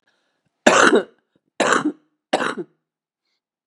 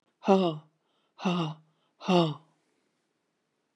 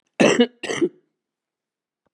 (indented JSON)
{
  "three_cough_length": "3.7 s",
  "three_cough_amplitude": 32768,
  "three_cough_signal_mean_std_ratio": 0.36,
  "exhalation_length": "3.8 s",
  "exhalation_amplitude": 13796,
  "exhalation_signal_mean_std_ratio": 0.35,
  "cough_length": "2.1 s",
  "cough_amplitude": 26043,
  "cough_signal_mean_std_ratio": 0.35,
  "survey_phase": "beta (2021-08-13 to 2022-03-07)",
  "age": "65+",
  "gender": "Female",
  "wearing_mask": "No",
  "symptom_new_continuous_cough": true,
  "symptom_shortness_of_breath": true,
  "symptom_onset": "7 days",
  "smoker_status": "Ex-smoker",
  "respiratory_condition_asthma": false,
  "respiratory_condition_other": false,
  "recruitment_source": "Test and Trace",
  "submission_delay": "2 days",
  "covid_test_result": "Positive",
  "covid_test_method": "RT-qPCR",
  "covid_ct_value": 20.7,
  "covid_ct_gene": "N gene",
  "covid_ct_mean": 21.4,
  "covid_viral_load": "94000 copies/ml",
  "covid_viral_load_category": "Low viral load (10K-1M copies/ml)"
}